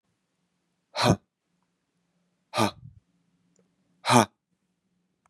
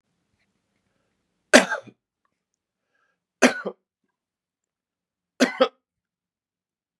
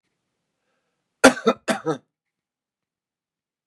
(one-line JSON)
{"exhalation_length": "5.3 s", "exhalation_amplitude": 24291, "exhalation_signal_mean_std_ratio": 0.23, "three_cough_length": "7.0 s", "three_cough_amplitude": 32768, "three_cough_signal_mean_std_ratio": 0.18, "cough_length": "3.7 s", "cough_amplitude": 32768, "cough_signal_mean_std_ratio": 0.2, "survey_phase": "beta (2021-08-13 to 2022-03-07)", "age": "45-64", "gender": "Male", "wearing_mask": "No", "symptom_none": true, "smoker_status": "Never smoked", "respiratory_condition_asthma": false, "respiratory_condition_other": false, "recruitment_source": "REACT", "submission_delay": "2 days", "covid_test_result": "Negative", "covid_test_method": "RT-qPCR", "influenza_a_test_result": "Negative", "influenza_b_test_result": "Negative"}